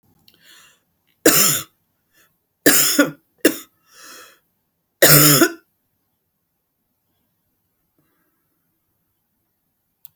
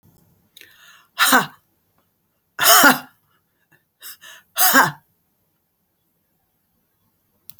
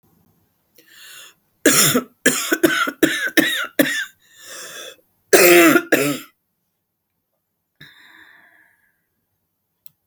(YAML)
three_cough_length: 10.2 s
three_cough_amplitude: 32768
three_cough_signal_mean_std_ratio: 0.28
exhalation_length: 7.6 s
exhalation_amplitude: 32768
exhalation_signal_mean_std_ratio: 0.28
cough_length: 10.1 s
cough_amplitude: 32768
cough_signal_mean_std_ratio: 0.38
survey_phase: beta (2021-08-13 to 2022-03-07)
age: 65+
gender: Female
wearing_mask: 'No'
symptom_cough_any: true
symptom_new_continuous_cough: true
symptom_runny_or_blocked_nose: true
symptom_sore_throat: true
symptom_change_to_sense_of_smell_or_taste: true
symptom_onset: 4 days
smoker_status: Ex-smoker
respiratory_condition_asthma: false
respiratory_condition_other: false
recruitment_source: Test and Trace
submission_delay: 2 days
covid_test_result: Positive
covid_test_method: RT-qPCR
covid_ct_value: 12.6
covid_ct_gene: ORF1ab gene
covid_ct_mean: 12.9
covid_viral_load: 59000000 copies/ml
covid_viral_load_category: High viral load (>1M copies/ml)